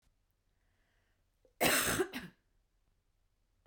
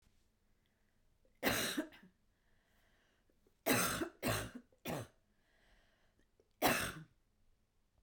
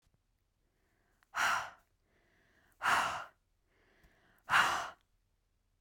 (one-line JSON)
{"cough_length": "3.7 s", "cough_amplitude": 4820, "cough_signal_mean_std_ratio": 0.31, "three_cough_length": "8.0 s", "three_cough_amplitude": 3941, "three_cough_signal_mean_std_ratio": 0.36, "exhalation_length": "5.8 s", "exhalation_amplitude": 5228, "exhalation_signal_mean_std_ratio": 0.34, "survey_phase": "beta (2021-08-13 to 2022-03-07)", "age": "18-44", "gender": "Female", "wearing_mask": "Yes", "symptom_runny_or_blocked_nose": true, "smoker_status": "Never smoked", "respiratory_condition_asthma": false, "respiratory_condition_other": false, "recruitment_source": "Test and Trace", "submission_delay": "2 days", "covid_test_result": "Positive", "covid_test_method": "RT-qPCR", "covid_ct_value": 22.5, "covid_ct_gene": "ORF1ab gene", "covid_ct_mean": 23.0, "covid_viral_load": "28000 copies/ml", "covid_viral_load_category": "Low viral load (10K-1M copies/ml)"}